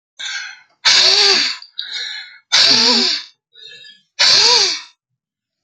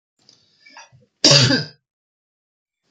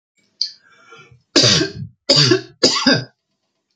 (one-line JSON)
{"exhalation_length": "5.6 s", "exhalation_amplitude": 32768, "exhalation_signal_mean_std_ratio": 0.57, "cough_length": "2.9 s", "cough_amplitude": 30810, "cough_signal_mean_std_ratio": 0.3, "three_cough_length": "3.8 s", "three_cough_amplitude": 32767, "three_cough_signal_mean_std_ratio": 0.45, "survey_phase": "beta (2021-08-13 to 2022-03-07)", "age": "45-64", "gender": "Male", "wearing_mask": "No", "symptom_none": true, "smoker_status": "Ex-smoker", "respiratory_condition_asthma": false, "respiratory_condition_other": false, "recruitment_source": "REACT", "submission_delay": "0 days", "covid_test_result": "Negative", "covid_test_method": "RT-qPCR"}